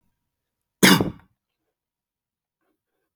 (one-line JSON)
{"cough_length": "3.2 s", "cough_amplitude": 32767, "cough_signal_mean_std_ratio": 0.21, "survey_phase": "beta (2021-08-13 to 2022-03-07)", "age": "18-44", "gender": "Male", "wearing_mask": "No", "symptom_none": true, "smoker_status": "Never smoked", "respiratory_condition_asthma": false, "respiratory_condition_other": false, "recruitment_source": "REACT", "submission_delay": "2 days", "covid_test_result": "Negative", "covid_test_method": "RT-qPCR"}